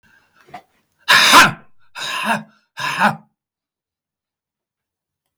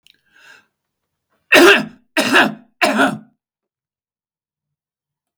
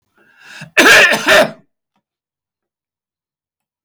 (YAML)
exhalation_length: 5.4 s
exhalation_amplitude: 32768
exhalation_signal_mean_std_ratio: 0.33
three_cough_length: 5.4 s
three_cough_amplitude: 32768
three_cough_signal_mean_std_ratio: 0.33
cough_length: 3.8 s
cough_amplitude: 32768
cough_signal_mean_std_ratio: 0.36
survey_phase: beta (2021-08-13 to 2022-03-07)
age: 65+
gender: Male
wearing_mask: 'No'
symptom_none: true
smoker_status: Never smoked
respiratory_condition_asthma: false
respiratory_condition_other: false
recruitment_source: REACT
submission_delay: 2 days
covid_test_result: Negative
covid_test_method: RT-qPCR
influenza_a_test_result: Negative
influenza_b_test_result: Negative